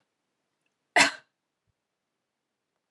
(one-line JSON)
{"cough_length": "2.9 s", "cough_amplitude": 16410, "cough_signal_mean_std_ratio": 0.17, "survey_phase": "beta (2021-08-13 to 2022-03-07)", "age": "18-44", "gender": "Female", "wearing_mask": "No", "symptom_none": true, "smoker_status": "Never smoked", "respiratory_condition_asthma": false, "respiratory_condition_other": false, "recruitment_source": "REACT", "submission_delay": "1 day", "covid_test_result": "Negative", "covid_test_method": "RT-qPCR", "influenza_a_test_result": "Unknown/Void", "influenza_b_test_result": "Unknown/Void"}